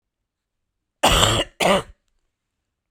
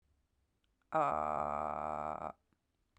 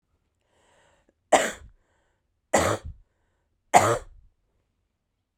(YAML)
cough_length: 2.9 s
cough_amplitude: 32767
cough_signal_mean_std_ratio: 0.38
exhalation_length: 3.0 s
exhalation_amplitude: 3273
exhalation_signal_mean_std_ratio: 0.44
three_cough_length: 5.4 s
three_cough_amplitude: 31807
three_cough_signal_mean_std_ratio: 0.26
survey_phase: beta (2021-08-13 to 2022-03-07)
age: 18-44
gender: Female
wearing_mask: 'Yes'
symptom_cough_any: true
symptom_new_continuous_cough: true
symptom_runny_or_blocked_nose: true
symptom_shortness_of_breath: true
symptom_sore_throat: true
symptom_abdominal_pain: true
symptom_diarrhoea: true
symptom_fatigue: true
symptom_fever_high_temperature: true
symptom_headache: true
symptom_change_to_sense_of_smell_or_taste: true
symptom_loss_of_taste: true
symptom_other: true
symptom_onset: 4 days
smoker_status: Never smoked
respiratory_condition_asthma: false
respiratory_condition_other: false
recruitment_source: Test and Trace
submission_delay: 2 days
covid_test_result: Positive
covid_test_method: RT-qPCR